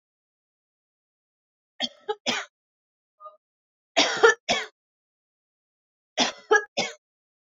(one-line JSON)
{"three_cough_length": "7.6 s", "three_cough_amplitude": 20082, "three_cough_signal_mean_std_ratio": 0.27, "survey_phase": "beta (2021-08-13 to 2022-03-07)", "age": "45-64", "gender": "Female", "wearing_mask": "No", "symptom_none": true, "smoker_status": "Never smoked", "respiratory_condition_asthma": false, "respiratory_condition_other": false, "recruitment_source": "REACT", "submission_delay": "1 day", "covid_test_result": "Negative", "covid_test_method": "RT-qPCR", "influenza_a_test_result": "Negative", "influenza_b_test_result": "Negative"}